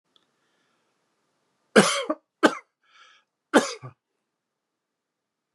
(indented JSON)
{
  "three_cough_length": "5.5 s",
  "three_cough_amplitude": 26442,
  "three_cough_signal_mean_std_ratio": 0.22,
  "survey_phase": "beta (2021-08-13 to 2022-03-07)",
  "age": "45-64",
  "gender": "Male",
  "wearing_mask": "No",
  "symptom_none": true,
  "smoker_status": "Ex-smoker",
  "respiratory_condition_asthma": false,
  "respiratory_condition_other": false,
  "recruitment_source": "REACT",
  "submission_delay": "2 days",
  "covid_test_result": "Negative",
  "covid_test_method": "RT-qPCR"
}